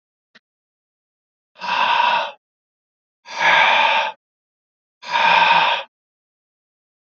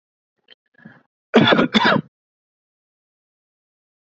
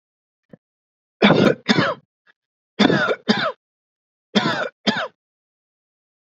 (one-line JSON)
{"exhalation_length": "7.1 s", "exhalation_amplitude": 25831, "exhalation_signal_mean_std_ratio": 0.46, "cough_length": "4.0 s", "cough_amplitude": 29416, "cough_signal_mean_std_ratio": 0.3, "three_cough_length": "6.4 s", "three_cough_amplitude": 32767, "three_cough_signal_mean_std_ratio": 0.38, "survey_phase": "beta (2021-08-13 to 2022-03-07)", "age": "45-64", "gender": "Male", "wearing_mask": "No", "symptom_none": true, "smoker_status": "Never smoked", "respiratory_condition_asthma": false, "respiratory_condition_other": false, "recruitment_source": "REACT", "submission_delay": "1 day", "covid_test_result": "Negative", "covid_test_method": "RT-qPCR", "influenza_a_test_result": "Negative", "influenza_b_test_result": "Negative"}